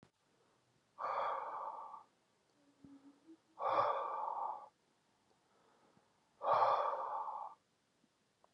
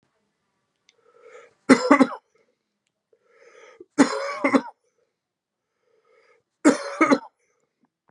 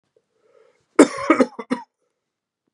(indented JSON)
{
  "exhalation_length": "8.5 s",
  "exhalation_amplitude": 2930,
  "exhalation_signal_mean_std_ratio": 0.47,
  "three_cough_length": "8.1 s",
  "three_cough_amplitude": 31300,
  "three_cough_signal_mean_std_ratio": 0.27,
  "cough_length": "2.7 s",
  "cough_amplitude": 32768,
  "cough_signal_mean_std_ratio": 0.25,
  "survey_phase": "beta (2021-08-13 to 2022-03-07)",
  "age": "45-64",
  "gender": "Male",
  "wearing_mask": "Yes",
  "symptom_cough_any": true,
  "symptom_new_continuous_cough": true,
  "symptom_runny_or_blocked_nose": true,
  "symptom_headache": true,
  "symptom_change_to_sense_of_smell_or_taste": true,
  "symptom_loss_of_taste": true,
  "symptom_onset": "7 days",
  "smoker_status": "Ex-smoker",
  "respiratory_condition_asthma": false,
  "respiratory_condition_other": false,
  "recruitment_source": "Test and Trace",
  "submission_delay": "2 days",
  "covid_test_result": "Positive",
  "covid_test_method": "ePCR"
}